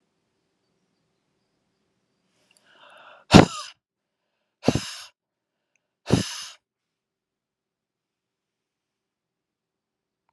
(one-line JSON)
{"exhalation_length": "10.3 s", "exhalation_amplitude": 32768, "exhalation_signal_mean_std_ratio": 0.14, "survey_phase": "alpha (2021-03-01 to 2021-08-12)", "age": "45-64", "gender": "Female", "wearing_mask": "No", "symptom_none": true, "symptom_onset": "4 days", "smoker_status": "Never smoked", "respiratory_condition_asthma": false, "respiratory_condition_other": false, "recruitment_source": "REACT", "submission_delay": "1 day", "covid_test_result": "Negative", "covid_test_method": "RT-qPCR"}